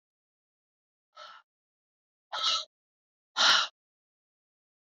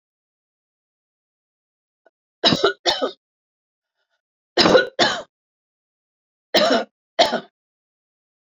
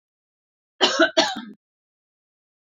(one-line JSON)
{"exhalation_length": "4.9 s", "exhalation_amplitude": 10640, "exhalation_signal_mean_std_ratio": 0.26, "three_cough_length": "8.5 s", "three_cough_amplitude": 28650, "three_cough_signal_mean_std_ratio": 0.31, "cough_length": "2.6 s", "cough_amplitude": 25142, "cough_signal_mean_std_ratio": 0.31, "survey_phase": "beta (2021-08-13 to 2022-03-07)", "age": "65+", "gender": "Female", "wearing_mask": "No", "symptom_cough_any": true, "symptom_runny_or_blocked_nose": true, "symptom_sore_throat": true, "symptom_fatigue": true, "symptom_fever_high_temperature": true, "symptom_headache": true, "smoker_status": "Never smoked", "respiratory_condition_asthma": false, "respiratory_condition_other": false, "recruitment_source": "Test and Trace", "submission_delay": "1 day", "covid_test_result": "Positive", "covid_test_method": "RT-qPCR", "covid_ct_value": 16.5, "covid_ct_gene": "ORF1ab gene", "covid_ct_mean": 17.0, "covid_viral_load": "2600000 copies/ml", "covid_viral_load_category": "High viral load (>1M copies/ml)"}